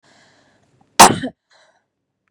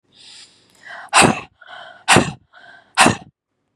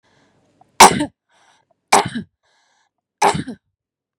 {
  "cough_length": "2.3 s",
  "cough_amplitude": 32768,
  "cough_signal_mean_std_ratio": 0.21,
  "exhalation_length": "3.8 s",
  "exhalation_amplitude": 32768,
  "exhalation_signal_mean_std_ratio": 0.34,
  "three_cough_length": "4.2 s",
  "three_cough_amplitude": 32768,
  "three_cough_signal_mean_std_ratio": 0.26,
  "survey_phase": "beta (2021-08-13 to 2022-03-07)",
  "age": "45-64",
  "gender": "Female",
  "wearing_mask": "No",
  "symptom_none": true,
  "smoker_status": "Never smoked",
  "respiratory_condition_asthma": false,
  "respiratory_condition_other": false,
  "recruitment_source": "REACT",
  "submission_delay": "2 days",
  "covid_test_result": "Negative",
  "covid_test_method": "RT-qPCR",
  "influenza_a_test_result": "Negative",
  "influenza_b_test_result": "Negative"
}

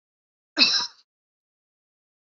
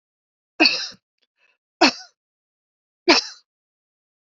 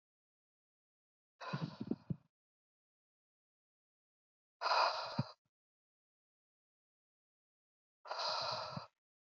{
  "cough_length": "2.2 s",
  "cough_amplitude": 22785,
  "cough_signal_mean_std_ratio": 0.27,
  "three_cough_length": "4.3 s",
  "three_cough_amplitude": 29346,
  "three_cough_signal_mean_std_ratio": 0.25,
  "exhalation_length": "9.4 s",
  "exhalation_amplitude": 3097,
  "exhalation_signal_mean_std_ratio": 0.31,
  "survey_phase": "beta (2021-08-13 to 2022-03-07)",
  "age": "45-64",
  "gender": "Female",
  "wearing_mask": "No",
  "symptom_cough_any": true,
  "symptom_fatigue": true,
  "smoker_status": "Ex-smoker",
  "respiratory_condition_asthma": false,
  "respiratory_condition_other": false,
  "recruitment_source": "REACT",
  "submission_delay": "2 days",
  "covid_test_result": "Negative",
  "covid_test_method": "RT-qPCR",
  "influenza_a_test_result": "Negative",
  "influenza_b_test_result": "Negative"
}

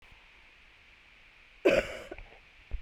{
  "cough_length": "2.8 s",
  "cough_amplitude": 8562,
  "cough_signal_mean_std_ratio": 0.31,
  "survey_phase": "beta (2021-08-13 to 2022-03-07)",
  "age": "45-64",
  "gender": "Female",
  "wearing_mask": "No",
  "symptom_none": true,
  "smoker_status": "Never smoked",
  "respiratory_condition_asthma": true,
  "respiratory_condition_other": false,
  "recruitment_source": "REACT",
  "submission_delay": "2 days",
  "covid_test_result": "Negative",
  "covid_test_method": "RT-qPCR",
  "influenza_a_test_result": "Negative",
  "influenza_b_test_result": "Negative"
}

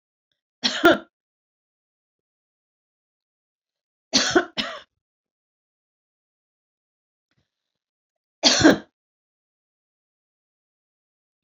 {
  "cough_length": "11.4 s",
  "cough_amplitude": 26616,
  "cough_signal_mean_std_ratio": 0.21,
  "survey_phase": "beta (2021-08-13 to 2022-03-07)",
  "age": "65+",
  "gender": "Female",
  "wearing_mask": "No",
  "symptom_none": true,
  "smoker_status": "Never smoked",
  "respiratory_condition_asthma": false,
  "respiratory_condition_other": false,
  "recruitment_source": "REACT",
  "submission_delay": "3 days",
  "covid_test_result": "Negative",
  "covid_test_method": "RT-qPCR"
}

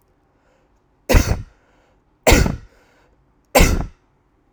{
  "three_cough_length": "4.5 s",
  "three_cough_amplitude": 32768,
  "three_cough_signal_mean_std_ratio": 0.33,
  "survey_phase": "alpha (2021-03-01 to 2021-08-12)",
  "age": "18-44",
  "gender": "Male",
  "wearing_mask": "No",
  "symptom_none": true,
  "smoker_status": "Never smoked",
  "respiratory_condition_asthma": false,
  "respiratory_condition_other": false,
  "recruitment_source": "REACT",
  "submission_delay": "2 days",
  "covid_test_result": "Negative",
  "covid_test_method": "RT-qPCR"
}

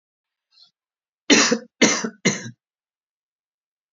{
  "three_cough_length": "3.9 s",
  "three_cough_amplitude": 29140,
  "three_cough_signal_mean_std_ratio": 0.31,
  "survey_phase": "beta (2021-08-13 to 2022-03-07)",
  "age": "45-64",
  "gender": "Male",
  "wearing_mask": "No",
  "symptom_none": true,
  "smoker_status": "Never smoked",
  "respiratory_condition_asthma": false,
  "respiratory_condition_other": false,
  "recruitment_source": "REACT",
  "submission_delay": "1 day",
  "covid_test_result": "Negative",
  "covid_test_method": "RT-qPCR",
  "influenza_a_test_result": "Negative",
  "influenza_b_test_result": "Negative"
}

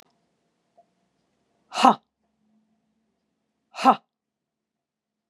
{
  "exhalation_length": "5.3 s",
  "exhalation_amplitude": 29668,
  "exhalation_signal_mean_std_ratio": 0.17,
  "survey_phase": "beta (2021-08-13 to 2022-03-07)",
  "age": "45-64",
  "gender": "Female",
  "wearing_mask": "No",
  "symptom_none": true,
  "smoker_status": "Ex-smoker",
  "respiratory_condition_asthma": false,
  "respiratory_condition_other": false,
  "recruitment_source": "REACT",
  "submission_delay": "1 day",
  "covid_test_result": "Negative",
  "covid_test_method": "RT-qPCR",
  "influenza_a_test_result": "Unknown/Void",
  "influenza_b_test_result": "Unknown/Void"
}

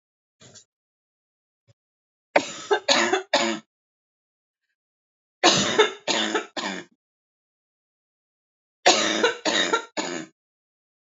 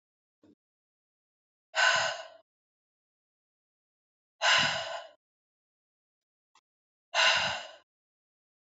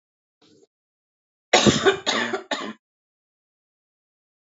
{
  "three_cough_length": "11.0 s",
  "three_cough_amplitude": 27535,
  "three_cough_signal_mean_std_ratio": 0.38,
  "exhalation_length": "8.8 s",
  "exhalation_amplitude": 8381,
  "exhalation_signal_mean_std_ratio": 0.31,
  "cough_length": "4.4 s",
  "cough_amplitude": 28476,
  "cough_signal_mean_std_ratio": 0.31,
  "survey_phase": "beta (2021-08-13 to 2022-03-07)",
  "age": "18-44",
  "gender": "Female",
  "wearing_mask": "No",
  "symptom_cough_any": true,
  "symptom_runny_or_blocked_nose": true,
  "symptom_sore_throat": true,
  "symptom_fatigue": true,
  "symptom_headache": true,
  "smoker_status": "Current smoker (e-cigarettes or vapes only)",
  "respiratory_condition_asthma": false,
  "respiratory_condition_other": false,
  "recruitment_source": "Test and Trace",
  "submission_delay": "1 day",
  "covid_test_result": "Positive",
  "covid_test_method": "RT-qPCR",
  "covid_ct_value": 25.0,
  "covid_ct_gene": "ORF1ab gene",
  "covid_ct_mean": 25.3,
  "covid_viral_load": "5000 copies/ml",
  "covid_viral_load_category": "Minimal viral load (< 10K copies/ml)"
}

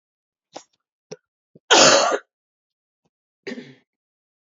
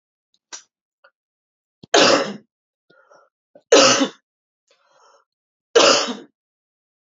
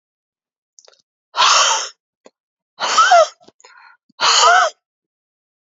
{
  "cough_length": "4.4 s",
  "cough_amplitude": 31394,
  "cough_signal_mean_std_ratio": 0.27,
  "three_cough_length": "7.2 s",
  "three_cough_amplitude": 32767,
  "three_cough_signal_mean_std_ratio": 0.3,
  "exhalation_length": "5.6 s",
  "exhalation_amplitude": 30310,
  "exhalation_signal_mean_std_ratio": 0.42,
  "survey_phase": "alpha (2021-03-01 to 2021-08-12)",
  "age": "45-64",
  "gender": "Female",
  "wearing_mask": "No",
  "symptom_new_continuous_cough": true,
  "symptom_shortness_of_breath": true,
  "symptom_diarrhoea": true,
  "symptom_headache": true,
  "symptom_onset": "4 days",
  "smoker_status": "Never smoked",
  "respiratory_condition_asthma": false,
  "respiratory_condition_other": true,
  "recruitment_source": "Test and Trace",
  "submission_delay": "1 day",
  "covid_test_result": "Positive",
  "covid_test_method": "RT-qPCR"
}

